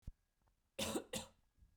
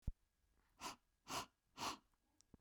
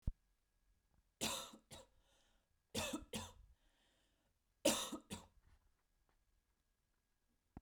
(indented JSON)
{
  "cough_length": "1.8 s",
  "cough_amplitude": 1301,
  "cough_signal_mean_std_ratio": 0.4,
  "exhalation_length": "2.6 s",
  "exhalation_amplitude": 1076,
  "exhalation_signal_mean_std_ratio": 0.35,
  "three_cough_length": "7.6 s",
  "three_cough_amplitude": 4015,
  "three_cough_signal_mean_std_ratio": 0.29,
  "survey_phase": "beta (2021-08-13 to 2022-03-07)",
  "age": "18-44",
  "gender": "Female",
  "wearing_mask": "No",
  "symptom_runny_or_blocked_nose": true,
  "symptom_diarrhoea": true,
  "symptom_onset": "3 days",
  "smoker_status": "Never smoked",
  "respiratory_condition_asthma": false,
  "respiratory_condition_other": false,
  "recruitment_source": "REACT",
  "submission_delay": "0 days",
  "covid_test_result": "Negative",
  "covid_test_method": "RT-qPCR"
}